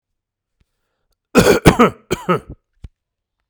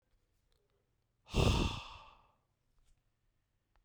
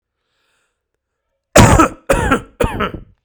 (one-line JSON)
{"cough_length": "3.5 s", "cough_amplitude": 32768, "cough_signal_mean_std_ratio": 0.32, "exhalation_length": "3.8 s", "exhalation_amplitude": 4788, "exhalation_signal_mean_std_ratio": 0.28, "three_cough_length": "3.2 s", "three_cough_amplitude": 32768, "three_cough_signal_mean_std_ratio": 0.39, "survey_phase": "beta (2021-08-13 to 2022-03-07)", "age": "18-44", "gender": "Male", "wearing_mask": "No", "symptom_cough_any": true, "symptom_runny_or_blocked_nose": true, "symptom_fatigue": true, "smoker_status": "Never smoked", "respiratory_condition_asthma": false, "respiratory_condition_other": false, "recruitment_source": "Test and Trace", "submission_delay": "2 days", "covid_test_result": "Positive", "covid_test_method": "RT-qPCR"}